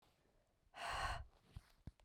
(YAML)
exhalation_length: 2.0 s
exhalation_amplitude: 946
exhalation_signal_mean_std_ratio: 0.46
survey_phase: beta (2021-08-13 to 2022-03-07)
age: 45-64
gender: Female
wearing_mask: 'No'
symptom_cough_any: true
symptom_fatigue: true
symptom_headache: true
symptom_other: true
symptom_onset: 5 days
smoker_status: Never smoked
respiratory_condition_asthma: false
respiratory_condition_other: false
recruitment_source: Test and Trace
submission_delay: 2 days
covid_test_result: Positive
covid_test_method: RT-qPCR
covid_ct_value: 14.2
covid_ct_gene: N gene